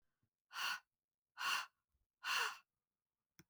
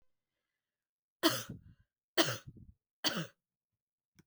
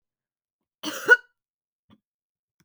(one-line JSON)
{"exhalation_length": "3.5 s", "exhalation_amplitude": 1675, "exhalation_signal_mean_std_ratio": 0.39, "three_cough_length": "4.3 s", "three_cough_amplitude": 8095, "three_cough_signal_mean_std_ratio": 0.27, "cough_length": "2.6 s", "cough_amplitude": 22650, "cough_signal_mean_std_ratio": 0.17, "survey_phase": "beta (2021-08-13 to 2022-03-07)", "age": "45-64", "gender": "Female", "wearing_mask": "No", "symptom_cough_any": true, "symptom_runny_or_blocked_nose": true, "symptom_headache": true, "smoker_status": "Never smoked", "respiratory_condition_asthma": false, "respiratory_condition_other": false, "recruitment_source": "Test and Trace", "submission_delay": "1 day", "covid_test_result": "Positive", "covid_test_method": "LFT"}